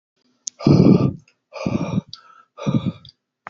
{"exhalation_length": "3.5 s", "exhalation_amplitude": 28674, "exhalation_signal_mean_std_ratio": 0.41, "survey_phase": "alpha (2021-03-01 to 2021-08-12)", "age": "18-44", "gender": "Male", "wearing_mask": "No", "symptom_none": true, "smoker_status": "Never smoked", "respiratory_condition_asthma": false, "respiratory_condition_other": false, "recruitment_source": "REACT", "submission_delay": "2 days", "covid_test_result": "Negative", "covid_test_method": "RT-qPCR"}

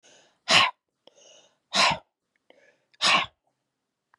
{"exhalation_length": "4.2 s", "exhalation_amplitude": 20340, "exhalation_signal_mean_std_ratio": 0.32, "survey_phase": "beta (2021-08-13 to 2022-03-07)", "age": "65+", "gender": "Female", "wearing_mask": "No", "symptom_cough_any": true, "symptom_runny_or_blocked_nose": true, "symptom_sore_throat": true, "symptom_diarrhoea": true, "symptom_fatigue": true, "symptom_loss_of_taste": true, "symptom_onset": "4 days", "smoker_status": "Ex-smoker", "respiratory_condition_asthma": false, "respiratory_condition_other": true, "recruitment_source": "Test and Trace", "submission_delay": "1 day", "covid_test_result": "Positive", "covid_test_method": "RT-qPCR", "covid_ct_value": 13.8, "covid_ct_gene": "N gene"}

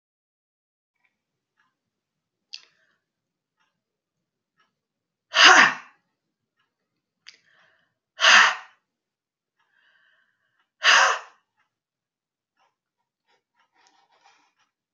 {"exhalation_length": "14.9 s", "exhalation_amplitude": 32419, "exhalation_signal_mean_std_ratio": 0.2, "survey_phase": "beta (2021-08-13 to 2022-03-07)", "age": "45-64", "gender": "Female", "wearing_mask": "No", "symptom_cough_any": true, "symptom_fatigue": true, "symptom_change_to_sense_of_smell_or_taste": true, "symptom_other": true, "symptom_onset": "2 days", "smoker_status": "Never smoked", "respiratory_condition_asthma": false, "respiratory_condition_other": false, "recruitment_source": "Test and Trace", "submission_delay": "1 day", "covid_test_result": "Positive", "covid_test_method": "RT-qPCR", "covid_ct_value": 29.9, "covid_ct_gene": "ORF1ab gene"}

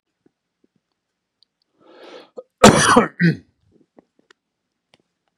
{"cough_length": "5.4 s", "cough_amplitude": 32768, "cough_signal_mean_std_ratio": 0.25, "survey_phase": "beta (2021-08-13 to 2022-03-07)", "age": "65+", "gender": "Male", "wearing_mask": "No", "symptom_none": true, "smoker_status": "Never smoked", "respiratory_condition_asthma": false, "respiratory_condition_other": false, "recruitment_source": "REACT", "submission_delay": "2 days", "covid_test_result": "Negative", "covid_test_method": "RT-qPCR", "influenza_a_test_result": "Unknown/Void", "influenza_b_test_result": "Unknown/Void"}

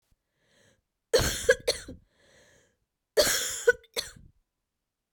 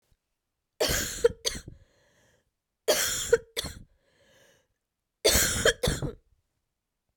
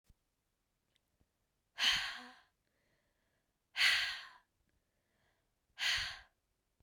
{"cough_length": "5.1 s", "cough_amplitude": 14465, "cough_signal_mean_std_ratio": 0.32, "three_cough_length": "7.2 s", "three_cough_amplitude": 13343, "three_cough_signal_mean_std_ratio": 0.37, "exhalation_length": "6.8 s", "exhalation_amplitude": 3749, "exhalation_signal_mean_std_ratio": 0.32, "survey_phase": "beta (2021-08-13 to 2022-03-07)", "age": "18-44", "gender": "Female", "wearing_mask": "No", "symptom_cough_any": true, "symptom_new_continuous_cough": true, "symptom_runny_or_blocked_nose": true, "symptom_shortness_of_breath": true, "symptom_sore_throat": true, "symptom_fatigue": true, "symptom_headache": true, "symptom_change_to_sense_of_smell_or_taste": true, "symptom_onset": "6 days", "smoker_status": "Never smoked", "respiratory_condition_asthma": false, "respiratory_condition_other": false, "recruitment_source": "Test and Trace", "submission_delay": "1 day", "covid_test_result": "Positive", "covid_test_method": "RT-qPCR", "covid_ct_value": 20.4, "covid_ct_gene": "ORF1ab gene"}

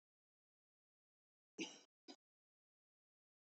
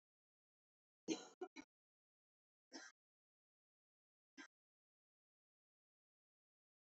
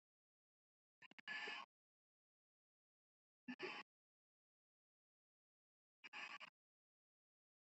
{"cough_length": "3.4 s", "cough_amplitude": 613, "cough_signal_mean_std_ratio": 0.18, "three_cough_length": "7.0 s", "three_cough_amplitude": 1022, "three_cough_signal_mean_std_ratio": 0.17, "exhalation_length": "7.7 s", "exhalation_amplitude": 435, "exhalation_signal_mean_std_ratio": 0.29, "survey_phase": "beta (2021-08-13 to 2022-03-07)", "age": "18-44", "gender": "Female", "wearing_mask": "No", "symptom_fatigue": true, "symptom_headache": true, "smoker_status": "Never smoked", "respiratory_condition_asthma": false, "respiratory_condition_other": false, "recruitment_source": "REACT", "submission_delay": "1 day", "covid_test_result": "Negative", "covid_test_method": "RT-qPCR", "influenza_a_test_result": "Negative", "influenza_b_test_result": "Negative"}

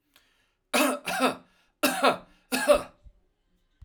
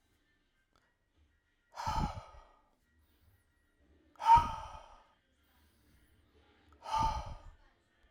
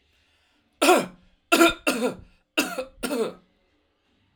{"cough_length": "3.8 s", "cough_amplitude": 16192, "cough_signal_mean_std_ratio": 0.42, "exhalation_length": "8.1 s", "exhalation_amplitude": 6587, "exhalation_signal_mean_std_ratio": 0.26, "three_cough_length": "4.4 s", "three_cough_amplitude": 20854, "three_cough_signal_mean_std_ratio": 0.39, "survey_phase": "alpha (2021-03-01 to 2021-08-12)", "age": "45-64", "gender": "Male", "wearing_mask": "No", "symptom_none": true, "smoker_status": "Never smoked", "respiratory_condition_asthma": false, "respiratory_condition_other": false, "recruitment_source": "REACT", "submission_delay": "1 day", "covid_test_result": "Negative", "covid_test_method": "RT-qPCR"}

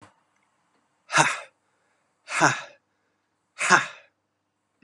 {"exhalation_length": "4.8 s", "exhalation_amplitude": 30567, "exhalation_signal_mean_std_ratio": 0.29, "survey_phase": "beta (2021-08-13 to 2022-03-07)", "age": "18-44", "gender": "Male", "wearing_mask": "No", "symptom_cough_any": true, "symptom_new_continuous_cough": true, "symptom_runny_or_blocked_nose": true, "symptom_sore_throat": true, "symptom_fatigue": true, "symptom_fever_high_temperature": true, "symptom_onset": "4 days", "smoker_status": "Never smoked", "respiratory_condition_asthma": false, "respiratory_condition_other": false, "recruitment_source": "REACT", "submission_delay": "0 days", "covid_test_result": "Negative", "covid_test_method": "RT-qPCR", "influenza_a_test_result": "Unknown/Void", "influenza_b_test_result": "Unknown/Void"}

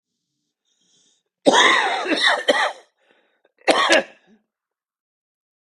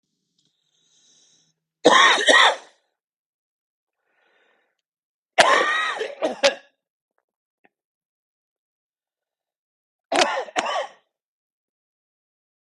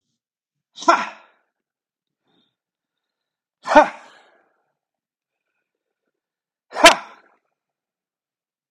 {"cough_length": "5.7 s", "cough_amplitude": 32767, "cough_signal_mean_std_ratio": 0.41, "three_cough_length": "12.7 s", "three_cough_amplitude": 32768, "three_cough_signal_mean_std_ratio": 0.3, "exhalation_length": "8.7 s", "exhalation_amplitude": 32768, "exhalation_signal_mean_std_ratio": 0.18, "survey_phase": "beta (2021-08-13 to 2022-03-07)", "age": "65+", "gender": "Male", "wearing_mask": "No", "symptom_cough_any": true, "symptom_runny_or_blocked_nose": true, "symptom_onset": "9 days", "smoker_status": "Never smoked", "respiratory_condition_asthma": true, "respiratory_condition_other": false, "recruitment_source": "REACT", "submission_delay": "1 day", "covid_test_result": "Negative", "covid_test_method": "RT-qPCR", "influenza_a_test_result": "Negative", "influenza_b_test_result": "Negative"}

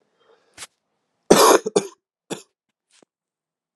{"cough_length": "3.8 s", "cough_amplitude": 32767, "cough_signal_mean_std_ratio": 0.25, "survey_phase": "alpha (2021-03-01 to 2021-08-12)", "age": "18-44", "gender": "Male", "wearing_mask": "No", "symptom_cough_any": true, "symptom_new_continuous_cough": true, "symptom_fatigue": true, "symptom_onset": "2 days", "smoker_status": "Never smoked", "respiratory_condition_asthma": false, "respiratory_condition_other": false, "recruitment_source": "Test and Trace", "submission_delay": "1 day", "covid_test_result": "Positive", "covid_test_method": "RT-qPCR", "covid_ct_value": 20.4, "covid_ct_gene": "N gene", "covid_ct_mean": 20.6, "covid_viral_load": "170000 copies/ml", "covid_viral_load_category": "Low viral load (10K-1M copies/ml)"}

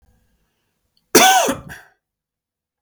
{"cough_length": "2.8 s", "cough_amplitude": 32768, "cough_signal_mean_std_ratio": 0.31, "survey_phase": "beta (2021-08-13 to 2022-03-07)", "age": "18-44", "gender": "Male", "wearing_mask": "No", "symptom_runny_or_blocked_nose": true, "symptom_onset": "3 days", "smoker_status": "Never smoked", "respiratory_condition_asthma": false, "respiratory_condition_other": false, "recruitment_source": "REACT", "submission_delay": "1 day", "covid_test_result": "Negative", "covid_test_method": "RT-qPCR", "influenza_a_test_result": "Unknown/Void", "influenza_b_test_result": "Unknown/Void"}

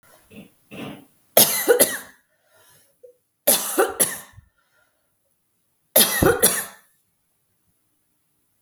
{"three_cough_length": "8.6 s", "three_cough_amplitude": 32768, "three_cough_signal_mean_std_ratio": 0.33, "survey_phase": "beta (2021-08-13 to 2022-03-07)", "age": "45-64", "gender": "Female", "wearing_mask": "No", "symptom_fatigue": true, "symptom_headache": true, "smoker_status": "Never smoked", "respiratory_condition_asthma": false, "respiratory_condition_other": false, "recruitment_source": "Test and Trace", "submission_delay": "1 day", "covid_test_result": "Positive", "covid_test_method": "RT-qPCR", "covid_ct_value": 26.3, "covid_ct_gene": "N gene"}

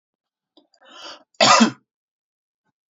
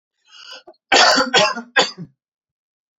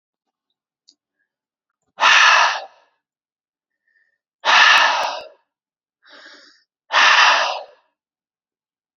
{"cough_length": "2.9 s", "cough_amplitude": 28328, "cough_signal_mean_std_ratio": 0.27, "three_cough_length": "3.0 s", "three_cough_amplitude": 32767, "three_cough_signal_mean_std_ratio": 0.41, "exhalation_length": "9.0 s", "exhalation_amplitude": 31055, "exhalation_signal_mean_std_ratio": 0.38, "survey_phase": "beta (2021-08-13 to 2022-03-07)", "age": "18-44", "gender": "Male", "wearing_mask": "No", "symptom_none": true, "smoker_status": "Never smoked", "respiratory_condition_asthma": false, "respiratory_condition_other": false, "recruitment_source": "REACT", "submission_delay": "1 day", "covid_test_result": "Negative", "covid_test_method": "RT-qPCR", "influenza_a_test_result": "Negative", "influenza_b_test_result": "Negative"}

